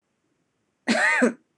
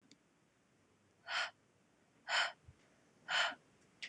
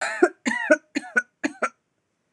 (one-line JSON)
{"cough_length": "1.6 s", "cough_amplitude": 14509, "cough_signal_mean_std_ratio": 0.45, "exhalation_length": "4.1 s", "exhalation_amplitude": 2488, "exhalation_signal_mean_std_ratio": 0.36, "three_cough_length": "2.3 s", "three_cough_amplitude": 24857, "three_cough_signal_mean_std_ratio": 0.39, "survey_phase": "beta (2021-08-13 to 2022-03-07)", "age": "18-44", "gender": "Female", "wearing_mask": "No", "symptom_runny_or_blocked_nose": true, "symptom_shortness_of_breath": true, "symptom_fatigue": true, "symptom_headache": true, "symptom_change_to_sense_of_smell_or_taste": true, "symptom_onset": "6 days", "smoker_status": "Prefer not to say", "respiratory_condition_asthma": false, "respiratory_condition_other": false, "recruitment_source": "Test and Trace", "submission_delay": "2 days", "covid_test_result": "Positive", "covid_test_method": "RT-qPCR", "covid_ct_value": 15.6, "covid_ct_gene": "N gene", "covid_ct_mean": 16.0, "covid_viral_load": "5800000 copies/ml", "covid_viral_load_category": "High viral load (>1M copies/ml)"}